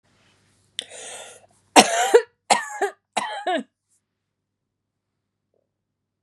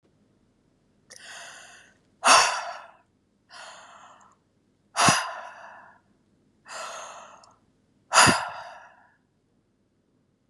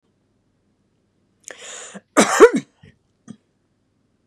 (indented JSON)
{
  "three_cough_length": "6.2 s",
  "three_cough_amplitude": 32768,
  "three_cough_signal_mean_std_ratio": 0.27,
  "exhalation_length": "10.5 s",
  "exhalation_amplitude": 22265,
  "exhalation_signal_mean_std_ratio": 0.28,
  "cough_length": "4.3 s",
  "cough_amplitude": 32768,
  "cough_signal_mean_std_ratio": 0.22,
  "survey_phase": "beta (2021-08-13 to 2022-03-07)",
  "age": "45-64",
  "gender": "Female",
  "wearing_mask": "No",
  "symptom_none": true,
  "symptom_onset": "3 days",
  "smoker_status": "Never smoked",
  "respiratory_condition_asthma": false,
  "respiratory_condition_other": false,
  "recruitment_source": "REACT",
  "submission_delay": "3 days",
  "covid_test_result": "Negative",
  "covid_test_method": "RT-qPCR",
  "influenza_a_test_result": "Unknown/Void",
  "influenza_b_test_result": "Unknown/Void"
}